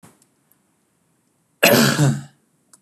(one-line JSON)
{"cough_length": "2.8 s", "cough_amplitude": 32768, "cough_signal_mean_std_ratio": 0.36, "survey_phase": "beta (2021-08-13 to 2022-03-07)", "age": "45-64", "gender": "Male", "wearing_mask": "No", "symptom_none": true, "smoker_status": "Never smoked", "respiratory_condition_asthma": false, "respiratory_condition_other": false, "recruitment_source": "REACT", "submission_delay": "1 day", "covid_test_result": "Negative", "covid_test_method": "RT-qPCR", "covid_ct_value": 37.6, "covid_ct_gene": "N gene", "influenza_a_test_result": "Negative", "influenza_b_test_result": "Negative"}